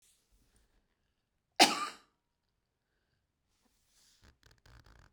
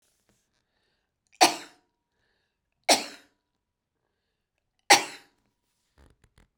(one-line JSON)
{"cough_length": "5.1 s", "cough_amplitude": 12907, "cough_signal_mean_std_ratio": 0.15, "three_cough_length": "6.6 s", "three_cough_amplitude": 25649, "three_cough_signal_mean_std_ratio": 0.18, "survey_phase": "beta (2021-08-13 to 2022-03-07)", "age": "65+", "gender": "Female", "wearing_mask": "No", "symptom_cough_any": true, "symptom_runny_or_blocked_nose": true, "smoker_status": "Never smoked", "respiratory_condition_asthma": false, "respiratory_condition_other": true, "recruitment_source": "REACT", "submission_delay": "1 day", "covid_test_result": "Negative", "covid_test_method": "RT-qPCR"}